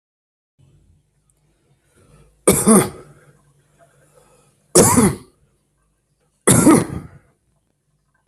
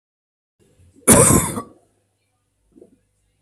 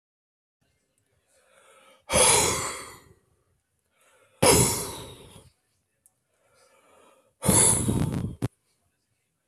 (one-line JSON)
{"three_cough_length": "8.3 s", "three_cough_amplitude": 32768, "three_cough_signal_mean_std_ratio": 0.31, "cough_length": "3.4 s", "cough_amplitude": 32768, "cough_signal_mean_std_ratio": 0.29, "exhalation_length": "9.5 s", "exhalation_amplitude": 21731, "exhalation_signal_mean_std_ratio": 0.36, "survey_phase": "beta (2021-08-13 to 2022-03-07)", "age": "45-64", "gender": "Male", "wearing_mask": "No", "symptom_cough_any": true, "symptom_runny_or_blocked_nose": true, "symptom_sore_throat": true, "symptom_fatigue": true, "symptom_headache": true, "symptom_change_to_sense_of_smell_or_taste": true, "symptom_loss_of_taste": true, "symptom_onset": "3 days", "smoker_status": "Never smoked", "respiratory_condition_asthma": true, "respiratory_condition_other": false, "recruitment_source": "Test and Trace", "submission_delay": "1 day", "covid_test_result": "Positive", "covid_test_method": "RT-qPCR", "covid_ct_value": 18.9, "covid_ct_gene": "S gene", "covid_ct_mean": 19.1, "covid_viral_load": "560000 copies/ml", "covid_viral_load_category": "Low viral load (10K-1M copies/ml)"}